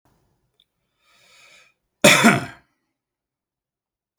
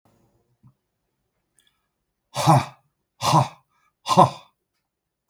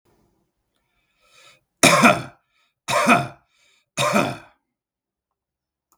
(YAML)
cough_length: 4.2 s
cough_amplitude: 32768
cough_signal_mean_std_ratio: 0.23
exhalation_length: 5.3 s
exhalation_amplitude: 32317
exhalation_signal_mean_std_ratio: 0.27
three_cough_length: 6.0 s
three_cough_amplitude: 32768
three_cough_signal_mean_std_ratio: 0.32
survey_phase: beta (2021-08-13 to 2022-03-07)
age: 45-64
gender: Male
wearing_mask: 'No'
symptom_none: true
smoker_status: Current smoker (1 to 10 cigarettes per day)
respiratory_condition_asthma: false
respiratory_condition_other: false
recruitment_source: REACT
submission_delay: 3 days
covid_test_result: Negative
covid_test_method: RT-qPCR